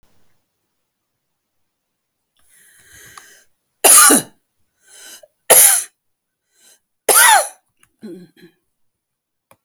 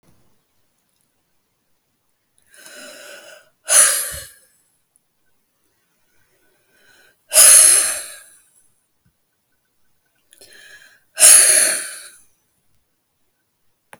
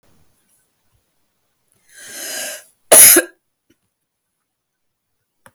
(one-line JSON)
{"three_cough_length": "9.6 s", "three_cough_amplitude": 32768, "three_cough_signal_mean_std_ratio": 0.28, "exhalation_length": "14.0 s", "exhalation_amplitude": 32768, "exhalation_signal_mean_std_ratio": 0.27, "cough_length": "5.5 s", "cough_amplitude": 32768, "cough_signal_mean_std_ratio": 0.22, "survey_phase": "alpha (2021-03-01 to 2021-08-12)", "age": "65+", "gender": "Female", "wearing_mask": "No", "symptom_none": true, "symptom_onset": "12 days", "smoker_status": "Never smoked", "respiratory_condition_asthma": false, "respiratory_condition_other": false, "recruitment_source": "REACT", "submission_delay": "2 days", "covid_test_result": "Negative", "covid_test_method": "RT-qPCR"}